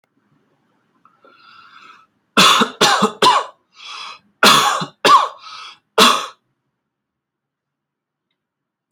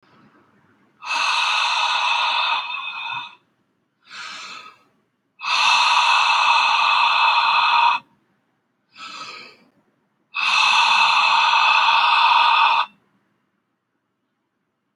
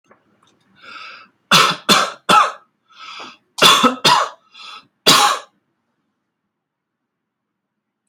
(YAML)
three_cough_length: 8.9 s
three_cough_amplitude: 32767
three_cough_signal_mean_std_ratio: 0.37
exhalation_length: 15.0 s
exhalation_amplitude: 21924
exhalation_signal_mean_std_ratio: 0.64
cough_length: 8.1 s
cough_amplitude: 31769
cough_signal_mean_std_ratio: 0.37
survey_phase: alpha (2021-03-01 to 2021-08-12)
age: 18-44
gender: Male
wearing_mask: 'No'
symptom_none: true
smoker_status: Ex-smoker
respiratory_condition_asthma: false
respiratory_condition_other: false
recruitment_source: REACT
submission_delay: 1 day
covid_test_result: Negative
covid_test_method: RT-qPCR